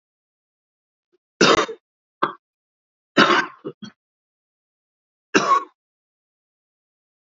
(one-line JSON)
{"three_cough_length": "7.3 s", "three_cough_amplitude": 29204, "three_cough_signal_mean_std_ratio": 0.27, "survey_phase": "beta (2021-08-13 to 2022-03-07)", "age": "45-64", "gender": "Male", "wearing_mask": "No", "symptom_cough_any": true, "symptom_runny_or_blocked_nose": true, "symptom_shortness_of_breath": true, "symptom_sore_throat": true, "symptom_fatigue": true, "symptom_fever_high_temperature": true, "symptom_headache": true, "symptom_other": true, "symptom_onset": "2 days", "smoker_status": "Never smoked", "respiratory_condition_asthma": false, "respiratory_condition_other": false, "recruitment_source": "Test and Trace", "submission_delay": "1 day", "covid_test_result": "Positive", "covid_test_method": "RT-qPCR", "covid_ct_value": 21.6, "covid_ct_gene": "N gene", "covid_ct_mean": 22.2, "covid_viral_load": "51000 copies/ml", "covid_viral_load_category": "Low viral load (10K-1M copies/ml)"}